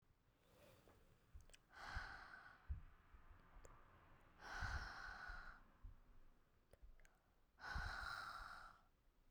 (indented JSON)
{
  "exhalation_length": "9.3 s",
  "exhalation_amplitude": 533,
  "exhalation_signal_mean_std_ratio": 0.61,
  "survey_phase": "beta (2021-08-13 to 2022-03-07)",
  "age": "18-44",
  "gender": "Female",
  "wearing_mask": "No",
  "symptom_cough_any": true,
  "symptom_runny_or_blocked_nose": true,
  "symptom_onset": "7 days",
  "smoker_status": "Never smoked",
  "respiratory_condition_asthma": false,
  "respiratory_condition_other": false,
  "recruitment_source": "Test and Trace",
  "submission_delay": "3 days",
  "covid_test_result": "Positive",
  "covid_test_method": "RT-qPCR"
}